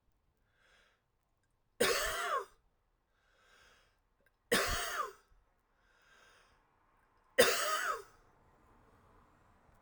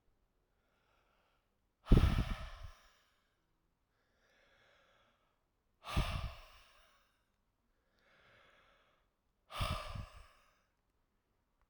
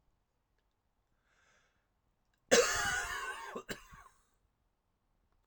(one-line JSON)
{"three_cough_length": "9.8 s", "three_cough_amplitude": 7637, "three_cough_signal_mean_std_ratio": 0.33, "exhalation_length": "11.7 s", "exhalation_amplitude": 8001, "exhalation_signal_mean_std_ratio": 0.23, "cough_length": "5.5 s", "cough_amplitude": 8820, "cough_signal_mean_std_ratio": 0.3, "survey_phase": "alpha (2021-03-01 to 2021-08-12)", "age": "45-64", "gender": "Male", "wearing_mask": "No", "symptom_fatigue": true, "symptom_change_to_sense_of_smell_or_taste": true, "symptom_loss_of_taste": true, "smoker_status": "Ex-smoker", "respiratory_condition_asthma": false, "respiratory_condition_other": false, "recruitment_source": "Test and Trace", "submission_delay": "2 days", "covid_test_result": "Positive", "covid_test_method": "RT-qPCR", "covid_ct_value": 15.1, "covid_ct_gene": "ORF1ab gene", "covid_ct_mean": 16.3, "covid_viral_load": "4600000 copies/ml", "covid_viral_load_category": "High viral load (>1M copies/ml)"}